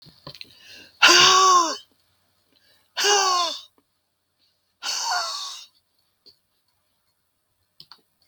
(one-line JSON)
{"exhalation_length": "8.3 s", "exhalation_amplitude": 32638, "exhalation_signal_mean_std_ratio": 0.37, "survey_phase": "beta (2021-08-13 to 2022-03-07)", "age": "65+", "gender": "Female", "wearing_mask": "No", "symptom_shortness_of_breath": true, "symptom_fatigue": true, "symptom_onset": "12 days", "smoker_status": "Never smoked", "respiratory_condition_asthma": false, "respiratory_condition_other": false, "recruitment_source": "REACT", "submission_delay": "1 day", "covid_test_result": "Negative", "covid_test_method": "RT-qPCR", "influenza_a_test_result": "Negative", "influenza_b_test_result": "Negative"}